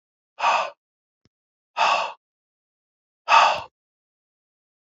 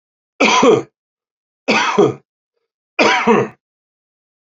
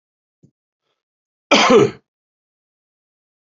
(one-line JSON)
{"exhalation_length": "4.9 s", "exhalation_amplitude": 26664, "exhalation_signal_mean_std_ratio": 0.32, "three_cough_length": "4.4 s", "three_cough_amplitude": 32767, "three_cough_signal_mean_std_ratio": 0.45, "cough_length": "3.5 s", "cough_amplitude": 29930, "cough_signal_mean_std_ratio": 0.27, "survey_phase": "beta (2021-08-13 to 2022-03-07)", "age": "65+", "gender": "Male", "wearing_mask": "No", "symptom_none": true, "smoker_status": "Ex-smoker", "respiratory_condition_asthma": false, "respiratory_condition_other": false, "recruitment_source": "REACT", "submission_delay": "1 day", "covid_test_result": "Negative", "covid_test_method": "RT-qPCR", "influenza_a_test_result": "Negative", "influenza_b_test_result": "Negative"}